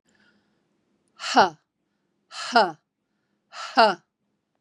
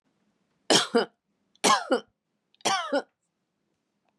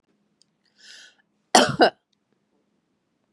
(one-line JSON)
{"exhalation_length": "4.6 s", "exhalation_amplitude": 24010, "exhalation_signal_mean_std_ratio": 0.27, "three_cough_length": "4.2 s", "three_cough_amplitude": 18981, "three_cough_signal_mean_std_ratio": 0.35, "cough_length": "3.3 s", "cough_amplitude": 31027, "cough_signal_mean_std_ratio": 0.22, "survey_phase": "beta (2021-08-13 to 2022-03-07)", "age": "45-64", "gender": "Female", "wearing_mask": "No", "symptom_none": true, "smoker_status": "Ex-smoker", "respiratory_condition_asthma": false, "respiratory_condition_other": false, "recruitment_source": "REACT", "submission_delay": "1 day", "covid_test_result": "Negative", "covid_test_method": "RT-qPCR", "influenza_a_test_result": "Negative", "influenza_b_test_result": "Negative"}